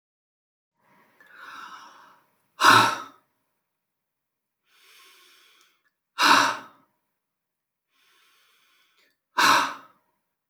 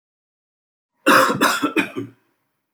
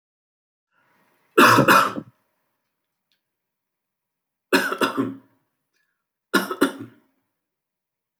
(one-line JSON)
{"exhalation_length": "10.5 s", "exhalation_amplitude": 22714, "exhalation_signal_mean_std_ratio": 0.26, "cough_length": "2.7 s", "cough_amplitude": 24931, "cough_signal_mean_std_ratio": 0.42, "three_cough_length": "8.2 s", "three_cough_amplitude": 28464, "three_cough_signal_mean_std_ratio": 0.29, "survey_phase": "beta (2021-08-13 to 2022-03-07)", "age": "45-64", "gender": "Male", "wearing_mask": "No", "symptom_none": true, "smoker_status": "Ex-smoker", "respiratory_condition_asthma": false, "respiratory_condition_other": false, "recruitment_source": "REACT", "submission_delay": "2 days", "covid_test_result": "Negative", "covid_test_method": "RT-qPCR"}